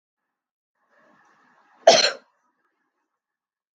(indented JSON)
{
  "cough_length": "3.8 s",
  "cough_amplitude": 31559,
  "cough_signal_mean_std_ratio": 0.19,
  "survey_phase": "beta (2021-08-13 to 2022-03-07)",
  "age": "45-64",
  "gender": "Female",
  "wearing_mask": "No",
  "symptom_none": true,
  "smoker_status": "Never smoked",
  "respiratory_condition_asthma": false,
  "respiratory_condition_other": false,
  "recruitment_source": "REACT",
  "submission_delay": "3 days",
  "covid_test_result": "Negative",
  "covid_test_method": "RT-qPCR",
  "influenza_a_test_result": "Negative",
  "influenza_b_test_result": "Negative"
}